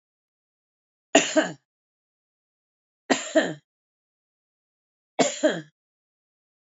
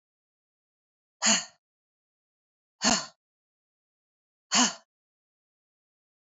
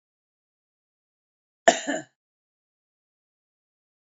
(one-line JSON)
{"three_cough_length": "6.7 s", "three_cough_amplitude": 26478, "three_cough_signal_mean_std_ratio": 0.26, "exhalation_length": "6.4 s", "exhalation_amplitude": 11323, "exhalation_signal_mean_std_ratio": 0.23, "cough_length": "4.1 s", "cough_amplitude": 24150, "cough_signal_mean_std_ratio": 0.14, "survey_phase": "beta (2021-08-13 to 2022-03-07)", "age": "18-44", "gender": "Female", "wearing_mask": "No", "symptom_runny_or_blocked_nose": true, "symptom_fatigue": true, "symptom_headache": true, "symptom_change_to_sense_of_smell_or_taste": true, "smoker_status": "Current smoker (11 or more cigarettes per day)", "respiratory_condition_asthma": false, "respiratory_condition_other": false, "recruitment_source": "Test and Trace", "submission_delay": "1 day", "covid_test_result": "Positive", "covid_test_method": "ePCR"}